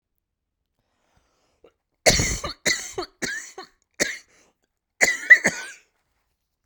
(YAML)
three_cough_length: 6.7 s
three_cough_amplitude: 32131
three_cough_signal_mean_std_ratio: 0.29
survey_phase: beta (2021-08-13 to 2022-03-07)
age: 18-44
gender: Female
wearing_mask: 'No'
symptom_cough_any: true
symptom_sore_throat: true
smoker_status: Never smoked
respiratory_condition_asthma: false
respiratory_condition_other: false
recruitment_source: Test and Trace
submission_delay: 2 days
covid_test_result: Negative
covid_test_method: RT-qPCR